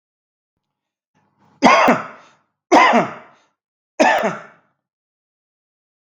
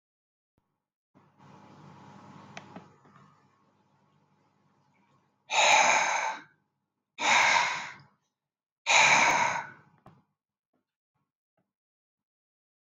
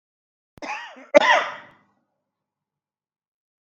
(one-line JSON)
{"three_cough_length": "6.1 s", "three_cough_amplitude": 32768, "three_cough_signal_mean_std_ratio": 0.34, "exhalation_length": "12.9 s", "exhalation_amplitude": 15178, "exhalation_signal_mean_std_ratio": 0.34, "cough_length": "3.7 s", "cough_amplitude": 32266, "cough_signal_mean_std_ratio": 0.24, "survey_phase": "beta (2021-08-13 to 2022-03-07)", "age": "45-64", "gender": "Male", "wearing_mask": "No", "symptom_none": true, "smoker_status": "Never smoked", "respiratory_condition_asthma": false, "respiratory_condition_other": false, "recruitment_source": "REACT", "submission_delay": "1 day", "covid_test_result": "Negative", "covid_test_method": "RT-qPCR", "influenza_a_test_result": "Negative", "influenza_b_test_result": "Negative"}